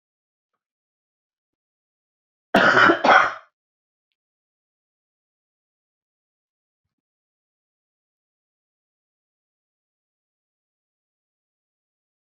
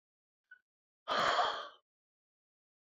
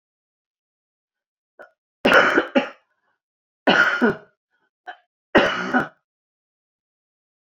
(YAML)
cough_length: 12.3 s
cough_amplitude: 26904
cough_signal_mean_std_ratio: 0.18
exhalation_length: 2.9 s
exhalation_amplitude: 3615
exhalation_signal_mean_std_ratio: 0.35
three_cough_length: 7.6 s
three_cough_amplitude: 27484
three_cough_signal_mean_std_ratio: 0.33
survey_phase: beta (2021-08-13 to 2022-03-07)
age: 65+
gender: Female
wearing_mask: 'No'
symptom_cough_any: true
smoker_status: Never smoked
respiratory_condition_asthma: true
respiratory_condition_other: false
recruitment_source: REACT
submission_delay: 2 days
covid_test_result: Negative
covid_test_method: RT-qPCR